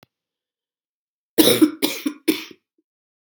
{"three_cough_length": "3.3 s", "three_cough_amplitude": 32768, "three_cough_signal_mean_std_ratio": 0.31, "survey_phase": "beta (2021-08-13 to 2022-03-07)", "age": "45-64", "gender": "Female", "wearing_mask": "No", "symptom_cough_any": true, "symptom_runny_or_blocked_nose": true, "symptom_change_to_sense_of_smell_or_taste": true, "symptom_onset": "3 days", "smoker_status": "Never smoked", "respiratory_condition_asthma": false, "respiratory_condition_other": false, "recruitment_source": "Test and Trace", "submission_delay": "2 days", "covid_test_result": "Positive", "covid_test_method": "RT-qPCR", "covid_ct_value": 15.3, "covid_ct_gene": "N gene", "covid_ct_mean": 16.5, "covid_viral_load": "3800000 copies/ml", "covid_viral_load_category": "High viral load (>1M copies/ml)"}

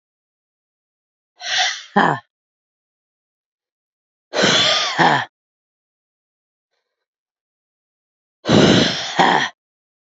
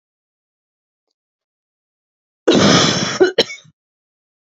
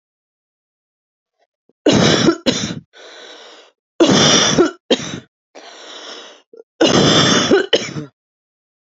{"exhalation_length": "10.2 s", "exhalation_amplitude": 32767, "exhalation_signal_mean_std_ratio": 0.37, "cough_length": "4.4 s", "cough_amplitude": 32601, "cough_signal_mean_std_ratio": 0.35, "three_cough_length": "8.9 s", "three_cough_amplitude": 32543, "three_cough_signal_mean_std_ratio": 0.47, "survey_phase": "beta (2021-08-13 to 2022-03-07)", "age": "18-44", "gender": "Female", "wearing_mask": "No", "symptom_fatigue": true, "symptom_onset": "12 days", "smoker_status": "Current smoker (1 to 10 cigarettes per day)", "respiratory_condition_asthma": false, "respiratory_condition_other": false, "recruitment_source": "REACT", "submission_delay": "1 day", "covid_test_result": "Negative", "covid_test_method": "RT-qPCR", "influenza_a_test_result": "Negative", "influenza_b_test_result": "Negative"}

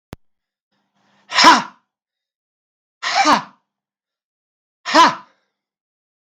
{"exhalation_length": "6.2 s", "exhalation_amplitude": 32768, "exhalation_signal_mean_std_ratio": 0.29, "survey_phase": "beta (2021-08-13 to 2022-03-07)", "age": "45-64", "gender": "Male", "wearing_mask": "No", "symptom_none": true, "smoker_status": "Never smoked", "recruitment_source": "REACT", "submission_delay": "2 days", "covid_test_result": "Negative", "covid_test_method": "RT-qPCR", "influenza_a_test_result": "Negative", "influenza_b_test_result": "Negative"}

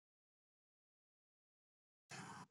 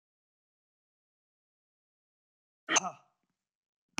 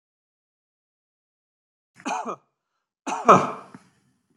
{"cough_length": "2.5 s", "cough_amplitude": 259, "cough_signal_mean_std_ratio": 0.31, "exhalation_length": "4.0 s", "exhalation_amplitude": 9296, "exhalation_signal_mean_std_ratio": 0.15, "three_cough_length": "4.4 s", "three_cough_amplitude": 27529, "three_cough_signal_mean_std_ratio": 0.22, "survey_phase": "beta (2021-08-13 to 2022-03-07)", "age": "65+", "gender": "Male", "wearing_mask": "No", "symptom_runny_or_blocked_nose": true, "symptom_onset": "12 days", "smoker_status": "Never smoked", "respiratory_condition_asthma": false, "respiratory_condition_other": false, "recruitment_source": "REACT", "submission_delay": "3 days", "covid_test_result": "Negative", "covid_test_method": "RT-qPCR", "influenza_a_test_result": "Negative", "influenza_b_test_result": "Negative"}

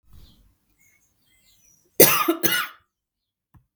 {"cough_length": "3.8 s", "cough_amplitude": 32768, "cough_signal_mean_std_ratio": 0.27, "survey_phase": "beta (2021-08-13 to 2022-03-07)", "age": "18-44", "gender": "Female", "wearing_mask": "No", "symptom_none": true, "symptom_onset": "6 days", "smoker_status": "Ex-smoker", "respiratory_condition_asthma": false, "respiratory_condition_other": false, "recruitment_source": "REACT", "submission_delay": "2 days", "covid_test_result": "Negative", "covid_test_method": "RT-qPCR", "influenza_a_test_result": "Negative", "influenza_b_test_result": "Negative"}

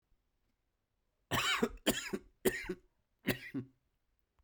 {"cough_length": "4.4 s", "cough_amplitude": 5326, "cough_signal_mean_std_ratio": 0.38, "survey_phase": "beta (2021-08-13 to 2022-03-07)", "age": "45-64", "gender": "Male", "wearing_mask": "No", "symptom_cough_any": true, "symptom_runny_or_blocked_nose": true, "symptom_sore_throat": true, "symptom_fatigue": true, "symptom_headache": true, "smoker_status": "Prefer not to say", "respiratory_condition_asthma": false, "respiratory_condition_other": false, "recruitment_source": "Test and Trace", "submission_delay": "2 days", "covid_test_result": "Positive", "covid_test_method": "RT-qPCR", "covid_ct_value": 22.7, "covid_ct_gene": "ORF1ab gene", "covid_ct_mean": 23.4, "covid_viral_load": "21000 copies/ml", "covid_viral_load_category": "Low viral load (10K-1M copies/ml)"}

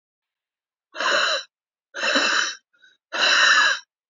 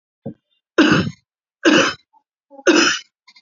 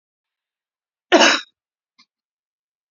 {"exhalation_length": "4.1 s", "exhalation_amplitude": 18820, "exhalation_signal_mean_std_ratio": 0.54, "three_cough_length": "3.4 s", "three_cough_amplitude": 32767, "three_cough_signal_mean_std_ratio": 0.43, "cough_length": "2.9 s", "cough_amplitude": 29047, "cough_signal_mean_std_ratio": 0.24, "survey_phase": "beta (2021-08-13 to 2022-03-07)", "age": "45-64", "gender": "Female", "wearing_mask": "No", "symptom_none": true, "symptom_onset": "9 days", "smoker_status": "Ex-smoker", "respiratory_condition_asthma": true, "respiratory_condition_other": true, "recruitment_source": "REACT", "submission_delay": "5 days", "covid_test_result": "Negative", "covid_test_method": "RT-qPCR"}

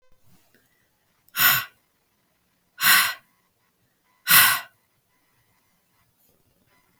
{"exhalation_length": "7.0 s", "exhalation_amplitude": 30510, "exhalation_signal_mean_std_ratio": 0.28, "survey_phase": "beta (2021-08-13 to 2022-03-07)", "age": "18-44", "gender": "Female", "wearing_mask": "No", "symptom_runny_or_blocked_nose": true, "symptom_sore_throat": true, "smoker_status": "Never smoked", "respiratory_condition_asthma": false, "respiratory_condition_other": false, "recruitment_source": "REACT", "submission_delay": "2 days", "covid_test_result": "Negative", "covid_test_method": "RT-qPCR", "influenza_a_test_result": "Negative", "influenza_b_test_result": "Negative"}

